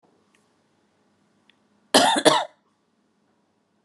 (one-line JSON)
{"cough_length": "3.8 s", "cough_amplitude": 30070, "cough_signal_mean_std_ratio": 0.26, "survey_phase": "beta (2021-08-13 to 2022-03-07)", "age": "45-64", "gender": "Female", "wearing_mask": "No", "symptom_none": true, "smoker_status": "Never smoked", "respiratory_condition_asthma": false, "respiratory_condition_other": false, "recruitment_source": "REACT", "submission_delay": "3 days", "covid_test_result": "Negative", "covid_test_method": "RT-qPCR"}